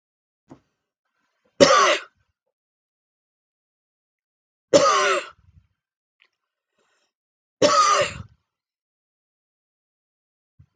{"three_cough_length": "10.8 s", "three_cough_amplitude": 32768, "three_cough_signal_mean_std_ratio": 0.28, "survey_phase": "beta (2021-08-13 to 2022-03-07)", "age": "65+", "gender": "Female", "wearing_mask": "No", "symptom_sore_throat": true, "symptom_onset": "13 days", "smoker_status": "Ex-smoker", "respiratory_condition_asthma": false, "respiratory_condition_other": false, "recruitment_source": "REACT", "submission_delay": "3 days", "covid_test_result": "Negative", "covid_test_method": "RT-qPCR"}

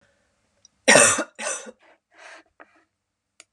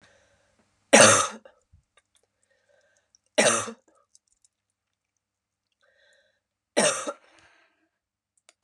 {"cough_length": "3.5 s", "cough_amplitude": 31215, "cough_signal_mean_std_ratio": 0.27, "three_cough_length": "8.6 s", "three_cough_amplitude": 31844, "three_cough_signal_mean_std_ratio": 0.23, "survey_phase": "beta (2021-08-13 to 2022-03-07)", "age": "45-64", "gender": "Female", "wearing_mask": "No", "symptom_runny_or_blocked_nose": true, "symptom_sore_throat": true, "symptom_fatigue": true, "symptom_headache": true, "symptom_change_to_sense_of_smell_or_taste": true, "smoker_status": "Never smoked", "respiratory_condition_asthma": false, "respiratory_condition_other": false, "recruitment_source": "Test and Trace", "submission_delay": "1 day", "covid_test_result": "Positive", "covid_test_method": "RT-qPCR", "covid_ct_value": 21.8, "covid_ct_gene": "ORF1ab gene"}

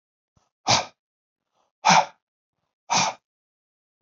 {"exhalation_length": "4.0 s", "exhalation_amplitude": 25287, "exhalation_signal_mean_std_ratio": 0.29, "survey_phase": "beta (2021-08-13 to 2022-03-07)", "age": "45-64", "gender": "Male", "wearing_mask": "No", "symptom_none": true, "smoker_status": "Never smoked", "respiratory_condition_asthma": false, "respiratory_condition_other": false, "recruitment_source": "REACT", "submission_delay": "1 day", "covid_test_result": "Negative", "covid_test_method": "RT-qPCR", "influenza_a_test_result": "Negative", "influenza_b_test_result": "Negative"}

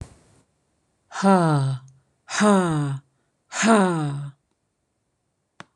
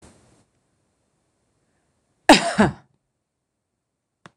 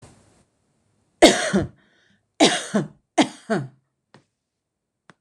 {"exhalation_length": "5.8 s", "exhalation_amplitude": 23163, "exhalation_signal_mean_std_ratio": 0.47, "cough_length": "4.4 s", "cough_amplitude": 26028, "cough_signal_mean_std_ratio": 0.19, "three_cough_length": "5.2 s", "three_cough_amplitude": 26028, "three_cough_signal_mean_std_ratio": 0.3, "survey_phase": "beta (2021-08-13 to 2022-03-07)", "age": "45-64", "gender": "Female", "wearing_mask": "No", "symptom_none": true, "smoker_status": "Never smoked", "respiratory_condition_asthma": false, "respiratory_condition_other": false, "recruitment_source": "REACT", "submission_delay": "1 day", "covid_test_result": "Negative", "covid_test_method": "RT-qPCR"}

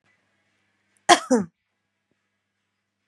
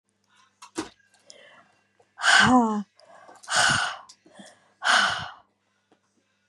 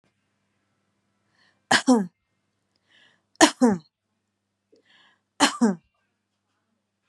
{"cough_length": "3.1 s", "cough_amplitude": 31942, "cough_signal_mean_std_ratio": 0.19, "exhalation_length": "6.5 s", "exhalation_amplitude": 16459, "exhalation_signal_mean_std_ratio": 0.39, "three_cough_length": "7.1 s", "three_cough_amplitude": 30351, "three_cough_signal_mean_std_ratio": 0.25, "survey_phase": "beta (2021-08-13 to 2022-03-07)", "age": "45-64", "gender": "Female", "wearing_mask": "No", "symptom_change_to_sense_of_smell_or_taste": true, "symptom_loss_of_taste": true, "smoker_status": "Ex-smoker", "respiratory_condition_asthma": false, "respiratory_condition_other": false, "recruitment_source": "REACT", "submission_delay": "2 days", "covid_test_result": "Negative", "covid_test_method": "RT-qPCR", "influenza_a_test_result": "Negative", "influenza_b_test_result": "Negative"}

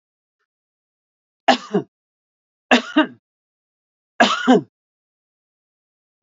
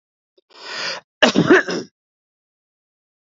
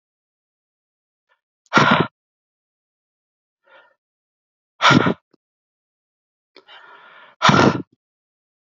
{"three_cough_length": "6.2 s", "three_cough_amplitude": 29160, "three_cough_signal_mean_std_ratio": 0.26, "cough_length": "3.2 s", "cough_amplitude": 28499, "cough_signal_mean_std_ratio": 0.32, "exhalation_length": "8.7 s", "exhalation_amplitude": 32768, "exhalation_signal_mean_std_ratio": 0.26, "survey_phase": "beta (2021-08-13 to 2022-03-07)", "age": "45-64", "gender": "Male", "wearing_mask": "No", "symptom_runny_or_blocked_nose": true, "symptom_diarrhoea": true, "symptom_headache": true, "symptom_onset": "3 days", "smoker_status": "Never smoked", "respiratory_condition_asthma": false, "respiratory_condition_other": false, "recruitment_source": "Test and Trace", "submission_delay": "1 day", "covid_test_result": "Positive", "covid_test_method": "RT-qPCR", "covid_ct_value": 21.6, "covid_ct_gene": "ORF1ab gene"}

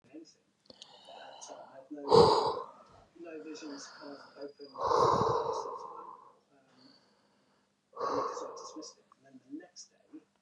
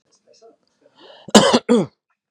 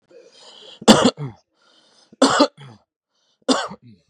{"exhalation_length": "10.4 s", "exhalation_amplitude": 11975, "exhalation_signal_mean_std_ratio": 0.38, "cough_length": "2.3 s", "cough_amplitude": 32768, "cough_signal_mean_std_ratio": 0.33, "three_cough_length": "4.1 s", "three_cough_amplitude": 32768, "three_cough_signal_mean_std_ratio": 0.32, "survey_phase": "beta (2021-08-13 to 2022-03-07)", "age": "45-64", "gender": "Male", "wearing_mask": "No", "symptom_none": true, "smoker_status": "Never smoked", "respiratory_condition_asthma": false, "respiratory_condition_other": false, "recruitment_source": "REACT", "submission_delay": "3 days", "covid_test_result": "Negative", "covid_test_method": "RT-qPCR", "influenza_a_test_result": "Negative", "influenza_b_test_result": "Negative"}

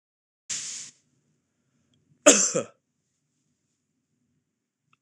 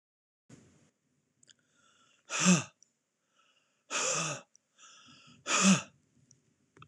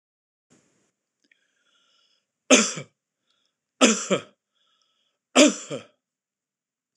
{"cough_length": "5.0 s", "cough_amplitude": 26028, "cough_signal_mean_std_ratio": 0.21, "exhalation_length": "6.9 s", "exhalation_amplitude": 9391, "exhalation_signal_mean_std_ratio": 0.3, "three_cough_length": "7.0 s", "three_cough_amplitude": 26028, "three_cough_signal_mean_std_ratio": 0.24, "survey_phase": "beta (2021-08-13 to 2022-03-07)", "age": "45-64", "gender": "Male", "wearing_mask": "No", "symptom_none": true, "smoker_status": "Never smoked", "respiratory_condition_asthma": false, "respiratory_condition_other": false, "recruitment_source": "REACT", "submission_delay": "6 days", "covid_test_result": "Negative", "covid_test_method": "RT-qPCR", "influenza_a_test_result": "Negative", "influenza_b_test_result": "Negative"}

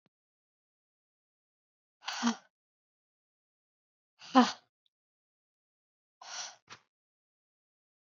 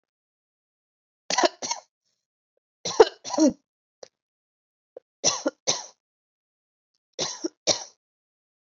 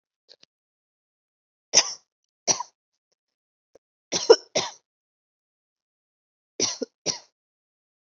{"exhalation_length": "8.0 s", "exhalation_amplitude": 11543, "exhalation_signal_mean_std_ratio": 0.16, "cough_length": "8.8 s", "cough_amplitude": 27367, "cough_signal_mean_std_ratio": 0.25, "three_cough_length": "8.0 s", "three_cough_amplitude": 28042, "three_cough_signal_mean_std_ratio": 0.19, "survey_phase": "alpha (2021-03-01 to 2021-08-12)", "age": "18-44", "gender": "Female", "wearing_mask": "No", "symptom_abdominal_pain": true, "smoker_status": "Never smoked", "respiratory_condition_asthma": true, "respiratory_condition_other": false, "recruitment_source": "REACT", "submission_delay": "2 days", "covid_test_result": "Negative", "covid_test_method": "RT-qPCR"}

